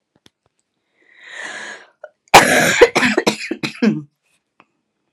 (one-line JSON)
{"cough_length": "5.1 s", "cough_amplitude": 32768, "cough_signal_mean_std_ratio": 0.37, "survey_phase": "alpha (2021-03-01 to 2021-08-12)", "age": "45-64", "gender": "Female", "wearing_mask": "No", "symptom_cough_any": true, "symptom_shortness_of_breath": true, "symptom_fatigue": true, "symptom_headache": true, "symptom_onset": "33 days", "smoker_status": "Never smoked", "respiratory_condition_asthma": true, "respiratory_condition_other": false, "recruitment_source": "Test and Trace", "submission_delay": "2 days", "covid_test_result": "Positive", "covid_test_method": "RT-qPCR"}